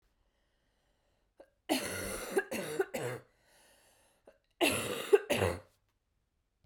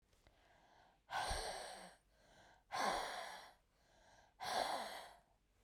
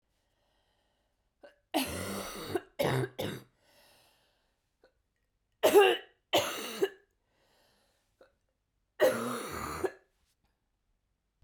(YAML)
cough_length: 6.7 s
cough_amplitude: 8908
cough_signal_mean_std_ratio: 0.38
exhalation_length: 5.6 s
exhalation_amplitude: 1591
exhalation_signal_mean_std_ratio: 0.52
three_cough_length: 11.4 s
three_cough_amplitude: 10255
three_cough_signal_mean_std_ratio: 0.33
survey_phase: beta (2021-08-13 to 2022-03-07)
age: 18-44
gender: Female
wearing_mask: 'No'
symptom_cough_any: true
symptom_runny_or_blocked_nose: true
symptom_shortness_of_breath: true
symptom_sore_throat: true
symptom_fatigue: true
symptom_headache: true
symptom_change_to_sense_of_smell_or_taste: true
smoker_status: Never smoked
respiratory_condition_asthma: false
respiratory_condition_other: false
recruitment_source: Test and Trace
submission_delay: 2 days
covid_test_result: Positive
covid_test_method: LFT